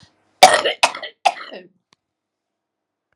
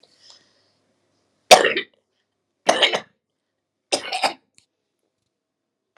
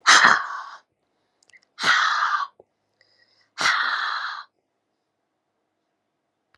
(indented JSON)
{
  "cough_length": "3.2 s",
  "cough_amplitude": 32768,
  "cough_signal_mean_std_ratio": 0.26,
  "three_cough_length": "6.0 s",
  "three_cough_amplitude": 32768,
  "three_cough_signal_mean_std_ratio": 0.23,
  "exhalation_length": "6.6 s",
  "exhalation_amplitude": 32091,
  "exhalation_signal_mean_std_ratio": 0.39,
  "survey_phase": "alpha (2021-03-01 to 2021-08-12)",
  "age": "65+",
  "gender": "Female",
  "wearing_mask": "No",
  "symptom_none": true,
  "smoker_status": "Never smoked",
  "respiratory_condition_asthma": false,
  "respiratory_condition_other": false,
  "recruitment_source": "REACT",
  "submission_delay": "3 days",
  "covid_test_result": "Negative",
  "covid_test_method": "RT-qPCR"
}